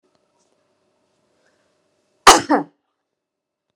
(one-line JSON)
{"cough_length": "3.8 s", "cough_amplitude": 32768, "cough_signal_mean_std_ratio": 0.19, "survey_phase": "beta (2021-08-13 to 2022-03-07)", "age": "45-64", "gender": "Female", "wearing_mask": "No", "symptom_none": true, "smoker_status": "Never smoked", "respiratory_condition_asthma": false, "respiratory_condition_other": false, "recruitment_source": "REACT", "submission_delay": "1 day", "covid_test_result": "Negative", "covid_test_method": "RT-qPCR"}